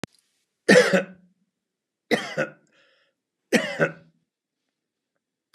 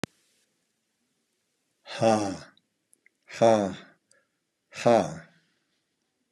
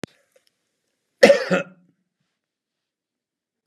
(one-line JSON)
{"three_cough_length": "5.5 s", "three_cough_amplitude": 28800, "three_cough_signal_mean_std_ratio": 0.28, "exhalation_length": "6.3 s", "exhalation_amplitude": 12789, "exhalation_signal_mean_std_ratio": 0.29, "cough_length": "3.7 s", "cough_amplitude": 32768, "cough_signal_mean_std_ratio": 0.21, "survey_phase": "beta (2021-08-13 to 2022-03-07)", "age": "65+", "gender": "Male", "wearing_mask": "No", "symptom_none": true, "smoker_status": "Ex-smoker", "respiratory_condition_asthma": false, "respiratory_condition_other": false, "recruitment_source": "REACT", "submission_delay": "2 days", "covid_test_result": "Negative", "covid_test_method": "RT-qPCR", "influenza_a_test_result": "Negative", "influenza_b_test_result": "Negative"}